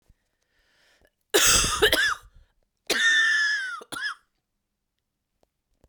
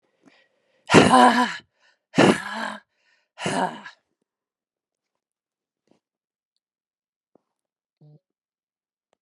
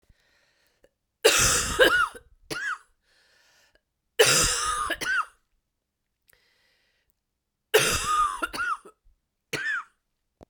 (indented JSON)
{
  "cough_length": "5.9 s",
  "cough_amplitude": 18547,
  "cough_signal_mean_std_ratio": 0.46,
  "exhalation_length": "9.2 s",
  "exhalation_amplitude": 32635,
  "exhalation_signal_mean_std_ratio": 0.26,
  "three_cough_length": "10.5 s",
  "three_cough_amplitude": 22182,
  "three_cough_signal_mean_std_ratio": 0.43,
  "survey_phase": "beta (2021-08-13 to 2022-03-07)",
  "age": "45-64",
  "gender": "Female",
  "wearing_mask": "No",
  "symptom_cough_any": true,
  "symptom_new_continuous_cough": true,
  "symptom_runny_or_blocked_nose": true,
  "symptom_sore_throat": true,
  "symptom_fever_high_temperature": true,
  "symptom_headache": true,
  "symptom_change_to_sense_of_smell_or_taste": true,
  "symptom_loss_of_taste": true,
  "symptom_onset": "3 days",
  "smoker_status": "Never smoked",
  "respiratory_condition_asthma": false,
  "respiratory_condition_other": false,
  "recruitment_source": "Test and Trace",
  "submission_delay": "2 days",
  "covid_test_result": "Positive",
  "covid_test_method": "RT-qPCR",
  "covid_ct_value": 12.9,
  "covid_ct_gene": "ORF1ab gene",
  "covid_ct_mean": 13.5,
  "covid_viral_load": "39000000 copies/ml",
  "covid_viral_load_category": "High viral load (>1M copies/ml)"
}